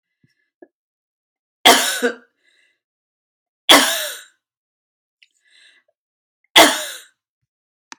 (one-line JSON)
{"three_cough_length": "8.0 s", "three_cough_amplitude": 32768, "three_cough_signal_mean_std_ratio": 0.26, "survey_phase": "beta (2021-08-13 to 2022-03-07)", "age": "45-64", "gender": "Female", "wearing_mask": "Yes", "symptom_cough_any": true, "symptom_sore_throat": true, "symptom_fatigue": true, "symptom_headache": true, "symptom_onset": "2 days", "smoker_status": "Never smoked", "respiratory_condition_asthma": false, "respiratory_condition_other": false, "recruitment_source": "Test and Trace", "submission_delay": "1 day", "covid_test_result": "Positive", "covid_test_method": "RT-qPCR", "covid_ct_value": 20.9, "covid_ct_gene": "ORF1ab gene"}